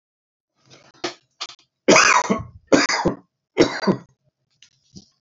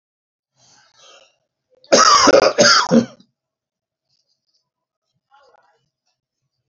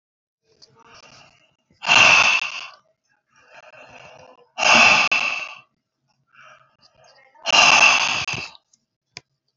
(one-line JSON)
{"three_cough_length": "5.2 s", "three_cough_amplitude": 31330, "three_cough_signal_mean_std_ratio": 0.37, "cough_length": "6.7 s", "cough_amplitude": 31429, "cough_signal_mean_std_ratio": 0.32, "exhalation_length": "9.6 s", "exhalation_amplitude": 28994, "exhalation_signal_mean_std_ratio": 0.39, "survey_phase": "beta (2021-08-13 to 2022-03-07)", "age": "65+", "gender": "Male", "wearing_mask": "No", "symptom_none": true, "smoker_status": "Ex-smoker", "respiratory_condition_asthma": false, "respiratory_condition_other": false, "recruitment_source": "REACT", "submission_delay": "2 days", "covid_test_result": "Negative", "covid_test_method": "RT-qPCR", "covid_ct_value": 42.0, "covid_ct_gene": "N gene"}